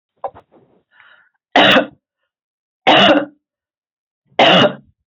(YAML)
three_cough_length: 5.1 s
three_cough_amplitude: 32768
three_cough_signal_mean_std_ratio: 0.38
survey_phase: beta (2021-08-13 to 2022-03-07)
age: 45-64
gender: Female
wearing_mask: 'No'
symptom_none: true
smoker_status: Never smoked
respiratory_condition_asthma: false
respiratory_condition_other: false
recruitment_source: REACT
submission_delay: 2 days
covid_test_result: Negative
covid_test_method: RT-qPCR
influenza_a_test_result: Negative
influenza_b_test_result: Negative